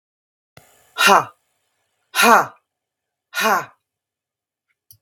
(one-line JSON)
{"exhalation_length": "5.0 s", "exhalation_amplitude": 32768, "exhalation_signal_mean_std_ratio": 0.3, "survey_phase": "beta (2021-08-13 to 2022-03-07)", "age": "45-64", "gender": "Female", "wearing_mask": "No", "symptom_none": true, "smoker_status": "Never smoked", "respiratory_condition_asthma": false, "respiratory_condition_other": false, "recruitment_source": "REACT", "submission_delay": "2 days", "covid_test_result": "Negative", "covid_test_method": "RT-qPCR"}